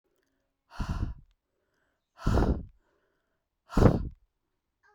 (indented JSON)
{
  "exhalation_length": "4.9 s",
  "exhalation_amplitude": 16503,
  "exhalation_signal_mean_std_ratio": 0.32,
  "survey_phase": "beta (2021-08-13 to 2022-03-07)",
  "age": "18-44",
  "gender": "Female",
  "wearing_mask": "No",
  "symptom_cough_any": true,
  "symptom_new_continuous_cough": true,
  "symptom_runny_or_blocked_nose": true,
  "symptom_fatigue": true,
  "symptom_fever_high_temperature": true,
  "symptom_headache": true,
  "symptom_change_to_sense_of_smell_or_taste": true,
  "symptom_loss_of_taste": true,
  "smoker_status": "Never smoked",
  "respiratory_condition_asthma": false,
  "respiratory_condition_other": false,
  "recruitment_source": "Test and Trace",
  "submission_delay": "1 day",
  "covid_test_result": "Positive",
  "covid_test_method": "LFT"
}